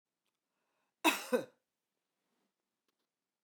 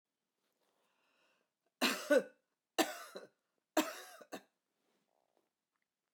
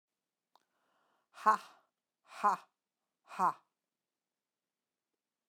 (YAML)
cough_length: 3.4 s
cough_amplitude: 5636
cough_signal_mean_std_ratio: 0.2
three_cough_length: 6.1 s
three_cough_amplitude: 4467
three_cough_signal_mean_std_ratio: 0.25
exhalation_length: 5.5 s
exhalation_amplitude: 6480
exhalation_signal_mean_std_ratio: 0.21
survey_phase: beta (2021-08-13 to 2022-03-07)
age: 65+
gender: Female
wearing_mask: 'No'
symptom_sore_throat: true
smoker_status: Never smoked
respiratory_condition_asthma: false
respiratory_condition_other: false
recruitment_source: Test and Trace
submission_delay: 1 day
covid_test_result: Positive
covid_test_method: RT-qPCR
covid_ct_value: 27.0
covid_ct_gene: ORF1ab gene